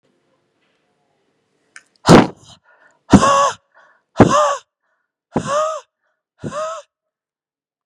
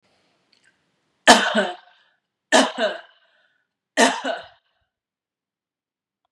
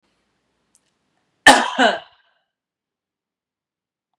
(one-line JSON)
{"exhalation_length": "7.9 s", "exhalation_amplitude": 32768, "exhalation_signal_mean_std_ratio": 0.31, "three_cough_length": "6.3 s", "three_cough_amplitude": 32768, "three_cough_signal_mean_std_ratio": 0.29, "cough_length": "4.2 s", "cough_amplitude": 32768, "cough_signal_mean_std_ratio": 0.22, "survey_phase": "beta (2021-08-13 to 2022-03-07)", "age": "45-64", "gender": "Female", "wearing_mask": "No", "symptom_none": true, "smoker_status": "Never smoked", "respiratory_condition_asthma": false, "respiratory_condition_other": false, "recruitment_source": "REACT", "submission_delay": "1 day", "covid_test_result": "Negative", "covid_test_method": "RT-qPCR", "influenza_a_test_result": "Negative", "influenza_b_test_result": "Negative"}